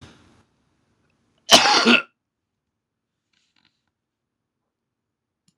{"cough_length": "5.6 s", "cough_amplitude": 26028, "cough_signal_mean_std_ratio": 0.23, "survey_phase": "beta (2021-08-13 to 2022-03-07)", "age": "65+", "gender": "Male", "wearing_mask": "No", "symptom_cough_any": true, "symptom_runny_or_blocked_nose": true, "symptom_shortness_of_breath": true, "symptom_fatigue": true, "symptom_loss_of_taste": true, "smoker_status": "Never smoked", "respiratory_condition_asthma": true, "respiratory_condition_other": false, "recruitment_source": "REACT", "submission_delay": "1 day", "covid_test_result": "Negative", "covid_test_method": "RT-qPCR", "influenza_a_test_result": "Negative", "influenza_b_test_result": "Negative"}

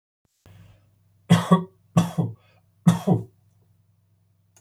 {"three_cough_length": "4.6 s", "three_cough_amplitude": 21165, "three_cough_signal_mean_std_ratio": 0.31, "survey_phase": "alpha (2021-03-01 to 2021-08-12)", "age": "65+", "gender": "Male", "wearing_mask": "No", "symptom_none": true, "smoker_status": "Never smoked", "respiratory_condition_asthma": false, "respiratory_condition_other": false, "recruitment_source": "REACT", "submission_delay": "1 day", "covid_test_result": "Negative", "covid_test_method": "RT-qPCR"}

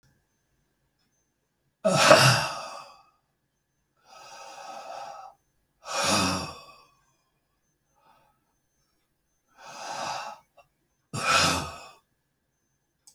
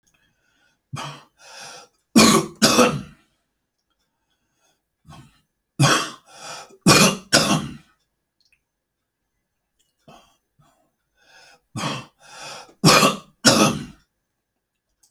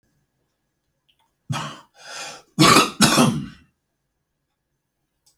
{"exhalation_length": "13.1 s", "exhalation_amplitude": 26578, "exhalation_signal_mean_std_ratio": 0.31, "three_cough_length": "15.1 s", "three_cough_amplitude": 32768, "three_cough_signal_mean_std_ratio": 0.32, "cough_length": "5.4 s", "cough_amplitude": 32767, "cough_signal_mean_std_ratio": 0.32, "survey_phase": "alpha (2021-03-01 to 2021-08-12)", "age": "65+", "gender": "Male", "wearing_mask": "No", "symptom_none": true, "smoker_status": "Ex-smoker", "respiratory_condition_asthma": false, "respiratory_condition_other": true, "recruitment_source": "REACT", "submission_delay": "2 days", "covid_test_result": "Negative", "covid_test_method": "RT-qPCR"}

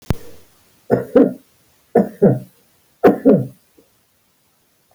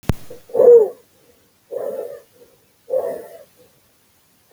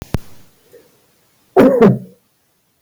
{"three_cough_length": "4.9 s", "three_cough_amplitude": 31810, "three_cough_signal_mean_std_ratio": 0.35, "exhalation_length": "4.5 s", "exhalation_amplitude": 26999, "exhalation_signal_mean_std_ratio": 0.33, "cough_length": "2.8 s", "cough_amplitude": 27450, "cough_signal_mean_std_ratio": 0.35, "survey_phase": "alpha (2021-03-01 to 2021-08-12)", "age": "65+", "gender": "Male", "wearing_mask": "No", "symptom_none": true, "symptom_onset": "12 days", "smoker_status": "Never smoked", "respiratory_condition_asthma": true, "respiratory_condition_other": false, "recruitment_source": "REACT", "submission_delay": "2 days", "covid_test_result": "Negative", "covid_test_method": "RT-qPCR"}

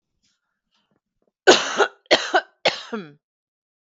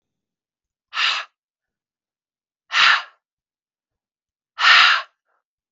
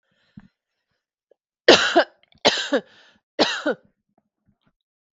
{"cough_length": "3.9 s", "cough_amplitude": 32768, "cough_signal_mean_std_ratio": 0.3, "exhalation_length": "5.7 s", "exhalation_amplitude": 31514, "exhalation_signal_mean_std_ratio": 0.31, "three_cough_length": "5.1 s", "three_cough_amplitude": 32768, "three_cough_signal_mean_std_ratio": 0.29, "survey_phase": "beta (2021-08-13 to 2022-03-07)", "age": "45-64", "gender": "Female", "wearing_mask": "No", "symptom_none": true, "smoker_status": "Ex-smoker", "respiratory_condition_asthma": false, "respiratory_condition_other": false, "recruitment_source": "REACT", "submission_delay": "2 days", "covid_test_result": "Negative", "covid_test_method": "RT-qPCR", "influenza_a_test_result": "Negative", "influenza_b_test_result": "Negative"}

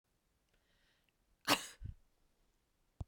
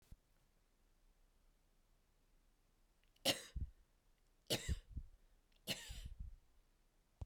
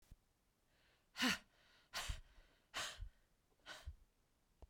{"cough_length": "3.1 s", "cough_amplitude": 5404, "cough_signal_mean_std_ratio": 0.2, "three_cough_length": "7.3 s", "three_cough_amplitude": 2682, "three_cough_signal_mean_std_ratio": 0.33, "exhalation_length": "4.7 s", "exhalation_amplitude": 2097, "exhalation_signal_mean_std_ratio": 0.35, "survey_phase": "beta (2021-08-13 to 2022-03-07)", "age": "65+", "gender": "Female", "wearing_mask": "No", "symptom_none": true, "smoker_status": "Never smoked", "respiratory_condition_asthma": false, "respiratory_condition_other": false, "recruitment_source": "REACT", "submission_delay": "2 days", "covid_test_result": "Negative", "covid_test_method": "RT-qPCR", "influenza_a_test_result": "Negative", "influenza_b_test_result": "Negative"}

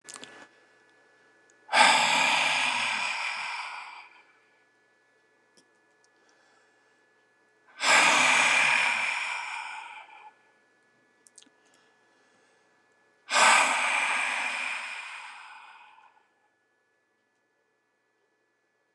{"exhalation_length": "18.9 s", "exhalation_amplitude": 18970, "exhalation_signal_mean_std_ratio": 0.43, "survey_phase": "alpha (2021-03-01 to 2021-08-12)", "age": "65+", "gender": "Male", "wearing_mask": "No", "symptom_none": true, "smoker_status": "Ex-smoker", "respiratory_condition_asthma": false, "respiratory_condition_other": false, "recruitment_source": "REACT", "submission_delay": "2 days", "covid_test_result": "Negative", "covid_test_method": "RT-qPCR"}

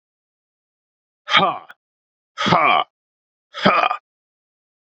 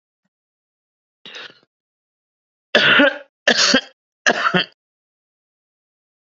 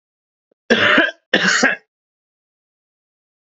{"exhalation_length": "4.9 s", "exhalation_amplitude": 32767, "exhalation_signal_mean_std_ratio": 0.35, "three_cough_length": "6.3 s", "three_cough_amplitude": 32767, "three_cough_signal_mean_std_ratio": 0.32, "cough_length": "3.4 s", "cough_amplitude": 30731, "cough_signal_mean_std_ratio": 0.39, "survey_phase": "beta (2021-08-13 to 2022-03-07)", "age": "45-64", "gender": "Male", "wearing_mask": "No", "symptom_new_continuous_cough": true, "symptom_runny_or_blocked_nose": true, "symptom_sore_throat": true, "symptom_fatigue": true, "symptom_headache": true, "symptom_onset": "3 days", "smoker_status": "Ex-smoker", "respiratory_condition_asthma": false, "respiratory_condition_other": false, "recruitment_source": "Test and Trace", "submission_delay": "2 days", "covid_test_result": "Positive", "covid_test_method": "RT-qPCR", "covid_ct_value": 16.6, "covid_ct_gene": "ORF1ab gene", "covid_ct_mean": 16.7, "covid_viral_load": "3400000 copies/ml", "covid_viral_load_category": "High viral load (>1M copies/ml)"}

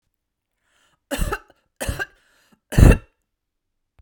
{"three_cough_length": "4.0 s", "three_cough_amplitude": 32768, "three_cough_signal_mean_std_ratio": 0.24, "survey_phase": "beta (2021-08-13 to 2022-03-07)", "age": "45-64", "gender": "Female", "wearing_mask": "No", "symptom_none": true, "smoker_status": "Ex-smoker", "respiratory_condition_asthma": false, "respiratory_condition_other": false, "recruitment_source": "REACT", "submission_delay": "2 days", "covid_test_result": "Negative", "covid_test_method": "RT-qPCR", "influenza_a_test_result": "Negative", "influenza_b_test_result": "Negative"}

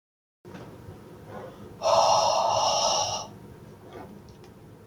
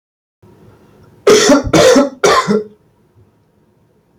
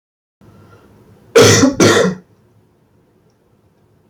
{"exhalation_length": "4.9 s", "exhalation_amplitude": 11104, "exhalation_signal_mean_std_ratio": 0.55, "three_cough_length": "4.2 s", "three_cough_amplitude": 30372, "three_cough_signal_mean_std_ratio": 0.46, "cough_length": "4.1 s", "cough_amplitude": 32768, "cough_signal_mean_std_ratio": 0.37, "survey_phase": "beta (2021-08-13 to 2022-03-07)", "age": "18-44", "gender": "Male", "wearing_mask": "No", "symptom_none": true, "smoker_status": "Never smoked", "respiratory_condition_asthma": false, "respiratory_condition_other": false, "recruitment_source": "REACT", "submission_delay": "2 days", "covid_test_result": "Negative", "covid_test_method": "RT-qPCR", "influenza_a_test_result": "Negative", "influenza_b_test_result": "Negative"}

